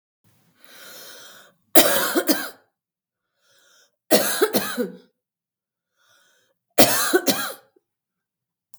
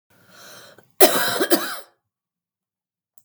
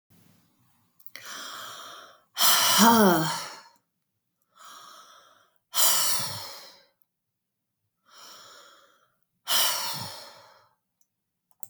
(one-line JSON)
{"three_cough_length": "8.8 s", "three_cough_amplitude": 32768, "three_cough_signal_mean_std_ratio": 0.34, "cough_length": "3.2 s", "cough_amplitude": 32768, "cough_signal_mean_std_ratio": 0.31, "exhalation_length": "11.7 s", "exhalation_amplitude": 18862, "exhalation_signal_mean_std_ratio": 0.37, "survey_phase": "beta (2021-08-13 to 2022-03-07)", "age": "45-64", "gender": "Female", "wearing_mask": "No", "symptom_none": true, "smoker_status": "Current smoker (11 or more cigarettes per day)", "respiratory_condition_asthma": false, "respiratory_condition_other": false, "recruitment_source": "REACT", "submission_delay": "3 days", "covid_test_result": "Negative", "covid_test_method": "RT-qPCR"}